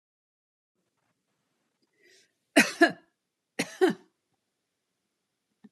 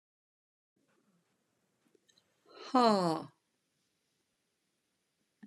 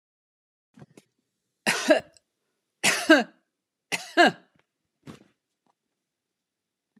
{"cough_length": "5.7 s", "cough_amplitude": 20174, "cough_signal_mean_std_ratio": 0.2, "exhalation_length": "5.5 s", "exhalation_amplitude": 7061, "exhalation_signal_mean_std_ratio": 0.21, "three_cough_length": "7.0 s", "three_cough_amplitude": 24328, "three_cough_signal_mean_std_ratio": 0.25, "survey_phase": "alpha (2021-03-01 to 2021-08-12)", "age": "65+", "gender": "Female", "wearing_mask": "No", "symptom_none": true, "smoker_status": "Never smoked", "respiratory_condition_asthma": false, "respiratory_condition_other": false, "recruitment_source": "REACT", "submission_delay": "1 day", "covid_test_result": "Negative", "covid_test_method": "RT-qPCR"}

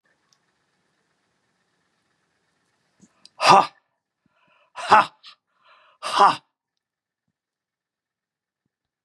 {"exhalation_length": "9.0 s", "exhalation_amplitude": 30790, "exhalation_signal_mean_std_ratio": 0.2, "survey_phase": "beta (2021-08-13 to 2022-03-07)", "age": "65+", "gender": "Male", "wearing_mask": "No", "symptom_cough_any": true, "symptom_runny_or_blocked_nose": true, "symptom_sore_throat": true, "symptom_onset": "3 days", "smoker_status": "Never smoked", "respiratory_condition_asthma": false, "respiratory_condition_other": false, "recruitment_source": "REACT", "submission_delay": "2 days", "covid_test_result": "Positive", "covid_test_method": "RT-qPCR", "covid_ct_value": 15.0, "covid_ct_gene": "E gene", "influenza_a_test_result": "Negative", "influenza_b_test_result": "Negative"}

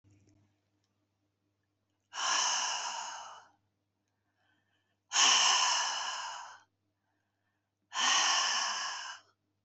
{"exhalation_length": "9.6 s", "exhalation_amplitude": 7404, "exhalation_signal_mean_std_ratio": 0.47, "survey_phase": "beta (2021-08-13 to 2022-03-07)", "age": "65+", "gender": "Female", "wearing_mask": "No", "symptom_cough_any": true, "symptom_headache": true, "symptom_onset": "6 days", "smoker_status": "Ex-smoker", "respiratory_condition_asthma": false, "respiratory_condition_other": false, "recruitment_source": "REACT", "submission_delay": "1 day", "covid_test_result": "Negative", "covid_test_method": "RT-qPCR", "influenza_a_test_result": "Negative", "influenza_b_test_result": "Negative"}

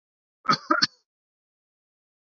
{"cough_length": "2.3 s", "cough_amplitude": 17992, "cough_signal_mean_std_ratio": 0.24, "survey_phase": "beta (2021-08-13 to 2022-03-07)", "age": "65+", "gender": "Male", "wearing_mask": "No", "symptom_none": true, "smoker_status": "Never smoked", "respiratory_condition_asthma": false, "respiratory_condition_other": false, "recruitment_source": "REACT", "submission_delay": "2 days", "covid_test_result": "Negative", "covid_test_method": "RT-qPCR"}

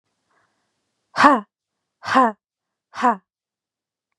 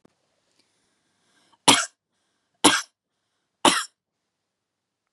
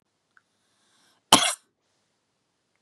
{"exhalation_length": "4.2 s", "exhalation_amplitude": 32767, "exhalation_signal_mean_std_ratio": 0.28, "three_cough_length": "5.1 s", "three_cough_amplitude": 32767, "three_cough_signal_mean_std_ratio": 0.22, "cough_length": "2.8 s", "cough_amplitude": 32768, "cough_signal_mean_std_ratio": 0.18, "survey_phase": "beta (2021-08-13 to 2022-03-07)", "age": "18-44", "gender": "Female", "wearing_mask": "No", "symptom_none": true, "smoker_status": "Ex-smoker", "respiratory_condition_asthma": false, "respiratory_condition_other": false, "recruitment_source": "REACT", "submission_delay": "1 day", "covid_test_result": "Negative", "covid_test_method": "RT-qPCR", "influenza_a_test_result": "Negative", "influenza_b_test_result": "Negative"}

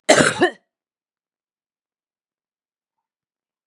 {"cough_length": "3.7 s", "cough_amplitude": 32767, "cough_signal_mean_std_ratio": 0.23, "survey_phase": "beta (2021-08-13 to 2022-03-07)", "age": "45-64", "gender": "Male", "wearing_mask": "No", "symptom_cough_any": true, "symptom_new_continuous_cough": true, "symptom_sore_throat": true, "symptom_fatigue": true, "symptom_change_to_sense_of_smell_or_taste": true, "smoker_status": "Ex-smoker", "respiratory_condition_asthma": true, "respiratory_condition_other": false, "recruitment_source": "Test and Trace", "submission_delay": "2 days", "covid_test_result": "Positive", "covid_test_method": "RT-qPCR"}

